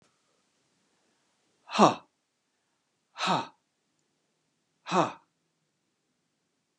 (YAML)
exhalation_length: 6.8 s
exhalation_amplitude: 19033
exhalation_signal_mean_std_ratio: 0.21
survey_phase: beta (2021-08-13 to 2022-03-07)
age: 65+
gender: Male
wearing_mask: 'No'
symptom_cough_any: true
smoker_status: Never smoked
respiratory_condition_asthma: false
respiratory_condition_other: false
recruitment_source: REACT
submission_delay: 6 days
covid_test_result: Negative
covid_test_method: RT-qPCR